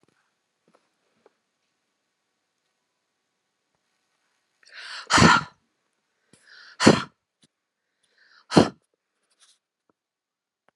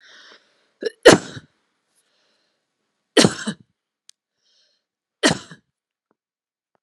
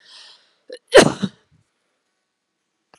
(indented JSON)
{
  "exhalation_length": "10.8 s",
  "exhalation_amplitude": 32505,
  "exhalation_signal_mean_std_ratio": 0.19,
  "three_cough_length": "6.8 s",
  "three_cough_amplitude": 32768,
  "three_cough_signal_mean_std_ratio": 0.19,
  "cough_length": "3.0 s",
  "cough_amplitude": 32768,
  "cough_signal_mean_std_ratio": 0.2,
  "survey_phase": "alpha (2021-03-01 to 2021-08-12)",
  "age": "45-64",
  "gender": "Female",
  "wearing_mask": "No",
  "symptom_none": true,
  "smoker_status": "Never smoked",
  "respiratory_condition_asthma": false,
  "respiratory_condition_other": false,
  "recruitment_source": "REACT",
  "submission_delay": "1 day",
  "covid_test_result": "Negative",
  "covid_test_method": "RT-qPCR"
}